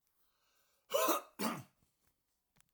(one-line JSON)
{"cough_length": "2.7 s", "cough_amplitude": 3330, "cough_signal_mean_std_ratio": 0.34, "survey_phase": "alpha (2021-03-01 to 2021-08-12)", "age": "65+", "gender": "Male", "wearing_mask": "No", "symptom_none": true, "smoker_status": "Ex-smoker", "respiratory_condition_asthma": false, "respiratory_condition_other": false, "recruitment_source": "REACT", "submission_delay": "2 days", "covid_test_result": "Negative", "covid_test_method": "RT-qPCR"}